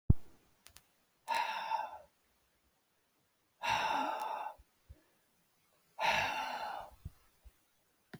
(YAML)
exhalation_length: 8.2 s
exhalation_amplitude: 8405
exhalation_signal_mean_std_ratio: 0.43
survey_phase: beta (2021-08-13 to 2022-03-07)
age: 65+
gender: Male
wearing_mask: 'No'
symptom_none: true
smoker_status: Never smoked
respiratory_condition_asthma: false
respiratory_condition_other: false
recruitment_source: REACT
submission_delay: 1 day
covid_test_result: Negative
covid_test_method: RT-qPCR
influenza_a_test_result: Negative
influenza_b_test_result: Negative